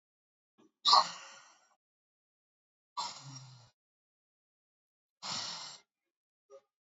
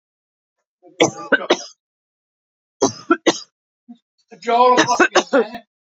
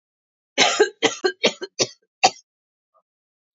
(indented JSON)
{
  "exhalation_length": "6.8 s",
  "exhalation_amplitude": 9394,
  "exhalation_signal_mean_std_ratio": 0.22,
  "three_cough_length": "5.9 s",
  "three_cough_amplitude": 29843,
  "three_cough_signal_mean_std_ratio": 0.38,
  "cough_length": "3.6 s",
  "cough_amplitude": 28105,
  "cough_signal_mean_std_ratio": 0.33,
  "survey_phase": "beta (2021-08-13 to 2022-03-07)",
  "age": "45-64",
  "gender": "Female",
  "wearing_mask": "No",
  "symptom_cough_any": true,
  "symptom_runny_or_blocked_nose": true,
  "symptom_shortness_of_breath": true,
  "symptom_sore_throat": true,
  "symptom_abdominal_pain": true,
  "symptom_fatigue": true,
  "symptom_fever_high_temperature": true,
  "symptom_headache": true,
  "symptom_onset": "2 days",
  "smoker_status": "Ex-smoker",
  "respiratory_condition_asthma": false,
  "respiratory_condition_other": false,
  "recruitment_source": "Test and Trace",
  "submission_delay": "1 day",
  "covid_test_result": "Positive",
  "covid_test_method": "RT-qPCR",
  "covid_ct_value": 16.4,
  "covid_ct_gene": "ORF1ab gene",
  "covid_ct_mean": 16.8,
  "covid_viral_load": "3100000 copies/ml",
  "covid_viral_load_category": "High viral load (>1M copies/ml)"
}